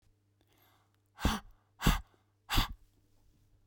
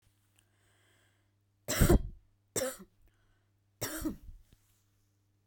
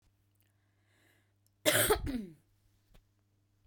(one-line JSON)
{"exhalation_length": "3.7 s", "exhalation_amplitude": 8139, "exhalation_signal_mean_std_ratio": 0.29, "three_cough_length": "5.5 s", "three_cough_amplitude": 8475, "three_cough_signal_mean_std_ratio": 0.27, "cough_length": "3.7 s", "cough_amplitude": 8939, "cough_signal_mean_std_ratio": 0.3, "survey_phase": "beta (2021-08-13 to 2022-03-07)", "age": "18-44", "gender": "Female", "wearing_mask": "No", "symptom_none": true, "smoker_status": "Never smoked", "respiratory_condition_asthma": false, "respiratory_condition_other": false, "recruitment_source": "REACT", "submission_delay": "1 day", "covid_test_result": "Negative", "covid_test_method": "RT-qPCR", "influenza_a_test_result": "Negative", "influenza_b_test_result": "Negative"}